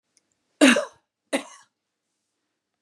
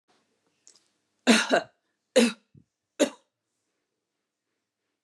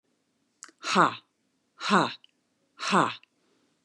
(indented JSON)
{
  "cough_length": "2.8 s",
  "cough_amplitude": 25314,
  "cough_signal_mean_std_ratio": 0.24,
  "three_cough_length": "5.0 s",
  "three_cough_amplitude": 18040,
  "three_cough_signal_mean_std_ratio": 0.25,
  "exhalation_length": "3.8 s",
  "exhalation_amplitude": 15906,
  "exhalation_signal_mean_std_ratio": 0.33,
  "survey_phase": "beta (2021-08-13 to 2022-03-07)",
  "age": "45-64",
  "gender": "Female",
  "wearing_mask": "No",
  "symptom_none": true,
  "smoker_status": "Ex-smoker",
  "respiratory_condition_asthma": false,
  "respiratory_condition_other": false,
  "recruitment_source": "Test and Trace",
  "submission_delay": "0 days",
  "covid_test_result": "Negative",
  "covid_test_method": "LFT"
}